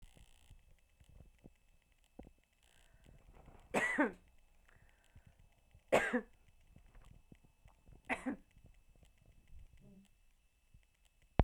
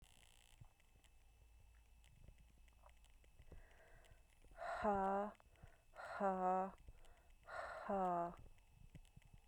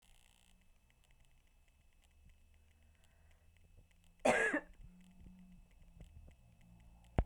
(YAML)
three_cough_length: 11.4 s
three_cough_amplitude: 8528
three_cough_signal_mean_std_ratio: 0.26
exhalation_length: 9.5 s
exhalation_amplitude: 1241
exhalation_signal_mean_std_ratio: 0.48
cough_length: 7.3 s
cough_amplitude: 4963
cough_signal_mean_std_ratio: 0.26
survey_phase: beta (2021-08-13 to 2022-03-07)
age: 18-44
gender: Female
wearing_mask: 'No'
symptom_cough_any: true
symptom_runny_or_blocked_nose: true
symptom_onset: 4 days
smoker_status: Never smoked
respiratory_condition_asthma: false
respiratory_condition_other: false
recruitment_source: Test and Trace
submission_delay: 2 days
covid_test_result: Positive
covid_test_method: RT-qPCR
covid_ct_value: 16.1
covid_ct_gene: ORF1ab gene
covid_ct_mean: 16.5
covid_viral_load: 3800000 copies/ml
covid_viral_load_category: High viral load (>1M copies/ml)